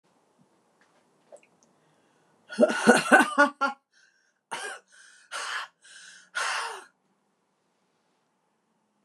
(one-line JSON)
{"exhalation_length": "9.0 s", "exhalation_amplitude": 27418, "exhalation_signal_mean_std_ratio": 0.28, "survey_phase": "beta (2021-08-13 to 2022-03-07)", "age": "65+", "gender": "Female", "wearing_mask": "No", "symptom_runny_or_blocked_nose": true, "smoker_status": "Never smoked", "respiratory_condition_asthma": false, "respiratory_condition_other": false, "recruitment_source": "REACT", "submission_delay": "2 days", "covid_test_result": "Negative", "covid_test_method": "RT-qPCR", "influenza_a_test_result": "Negative", "influenza_b_test_result": "Negative"}